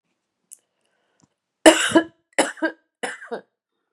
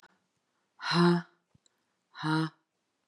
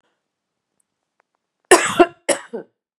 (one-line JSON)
{"three_cough_length": "3.9 s", "three_cough_amplitude": 32768, "three_cough_signal_mean_std_ratio": 0.26, "exhalation_length": "3.1 s", "exhalation_amplitude": 7655, "exhalation_signal_mean_std_ratio": 0.36, "cough_length": "3.0 s", "cough_amplitude": 32768, "cough_signal_mean_std_ratio": 0.25, "survey_phase": "beta (2021-08-13 to 2022-03-07)", "age": "45-64", "gender": "Female", "wearing_mask": "No", "symptom_none": true, "symptom_onset": "2 days", "smoker_status": "Ex-smoker", "respiratory_condition_asthma": false, "respiratory_condition_other": false, "recruitment_source": "Test and Trace", "submission_delay": "1 day", "covid_test_result": "Positive", "covid_test_method": "RT-qPCR", "covid_ct_value": 19.8, "covid_ct_gene": "N gene", "covid_ct_mean": 21.2, "covid_viral_load": "110000 copies/ml", "covid_viral_load_category": "Low viral load (10K-1M copies/ml)"}